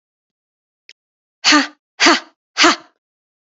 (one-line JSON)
{"exhalation_length": "3.6 s", "exhalation_amplitude": 32450, "exhalation_signal_mean_std_ratio": 0.32, "survey_phase": "beta (2021-08-13 to 2022-03-07)", "age": "18-44", "gender": "Female", "wearing_mask": "No", "symptom_runny_or_blocked_nose": true, "symptom_fatigue": true, "smoker_status": "Never smoked", "respiratory_condition_asthma": false, "respiratory_condition_other": false, "recruitment_source": "Test and Trace", "submission_delay": "2 days", "covid_test_result": "Positive", "covid_test_method": "ePCR"}